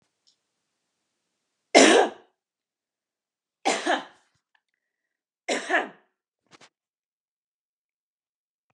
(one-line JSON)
{"three_cough_length": "8.7 s", "three_cough_amplitude": 30823, "three_cough_signal_mean_std_ratio": 0.23, "survey_phase": "beta (2021-08-13 to 2022-03-07)", "age": "45-64", "gender": "Female", "wearing_mask": "No", "symptom_none": true, "smoker_status": "Never smoked", "respiratory_condition_asthma": false, "respiratory_condition_other": false, "recruitment_source": "REACT", "submission_delay": "1 day", "covid_test_result": "Negative", "covid_test_method": "RT-qPCR", "influenza_a_test_result": "Negative", "influenza_b_test_result": "Negative"}